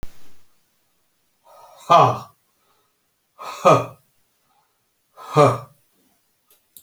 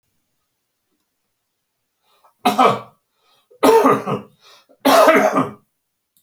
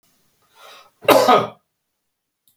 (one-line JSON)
{"exhalation_length": "6.8 s", "exhalation_amplitude": 29642, "exhalation_signal_mean_std_ratio": 0.28, "three_cough_length": "6.2 s", "three_cough_amplitude": 29609, "three_cough_signal_mean_std_ratio": 0.39, "cough_length": "2.6 s", "cough_amplitude": 31499, "cough_signal_mean_std_ratio": 0.31, "survey_phase": "beta (2021-08-13 to 2022-03-07)", "age": "65+", "gender": "Male", "wearing_mask": "No", "symptom_none": true, "smoker_status": "Never smoked", "respiratory_condition_asthma": false, "respiratory_condition_other": false, "recruitment_source": "REACT", "submission_delay": "3 days", "covid_test_result": "Negative", "covid_test_method": "RT-qPCR"}